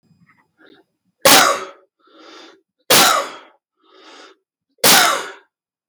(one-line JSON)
{"three_cough_length": "5.9 s", "three_cough_amplitude": 32768, "three_cough_signal_mean_std_ratio": 0.36, "survey_phase": "beta (2021-08-13 to 2022-03-07)", "age": "45-64", "gender": "Male", "wearing_mask": "No", "symptom_runny_or_blocked_nose": true, "smoker_status": "Never smoked", "respiratory_condition_asthma": true, "respiratory_condition_other": false, "recruitment_source": "REACT", "submission_delay": "0 days", "covid_test_result": "Negative", "covid_test_method": "RT-qPCR", "influenza_a_test_result": "Negative", "influenza_b_test_result": "Negative"}